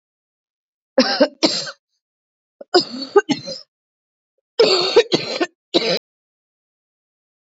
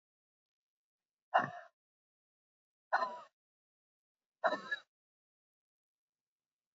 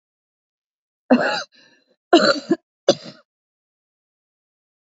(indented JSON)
{
  "three_cough_length": "7.6 s",
  "three_cough_amplitude": 30258,
  "three_cough_signal_mean_std_ratio": 0.36,
  "exhalation_length": "6.7 s",
  "exhalation_amplitude": 4957,
  "exhalation_signal_mean_std_ratio": 0.22,
  "cough_length": "4.9 s",
  "cough_amplitude": 28563,
  "cough_signal_mean_std_ratio": 0.27,
  "survey_phase": "beta (2021-08-13 to 2022-03-07)",
  "age": "45-64",
  "gender": "Female",
  "wearing_mask": "No",
  "symptom_new_continuous_cough": true,
  "symptom_sore_throat": true,
  "symptom_diarrhoea": true,
  "symptom_fatigue": true,
  "symptom_fever_high_temperature": true,
  "symptom_headache": true,
  "symptom_onset": "4 days",
  "smoker_status": "Never smoked",
  "respiratory_condition_asthma": true,
  "respiratory_condition_other": false,
  "recruitment_source": "Test and Trace",
  "submission_delay": "2 days",
  "covid_test_result": "Positive",
  "covid_test_method": "RT-qPCR",
  "covid_ct_value": 22.7,
  "covid_ct_gene": "ORF1ab gene",
  "covid_ct_mean": 23.2,
  "covid_viral_load": "25000 copies/ml",
  "covid_viral_load_category": "Low viral load (10K-1M copies/ml)"
}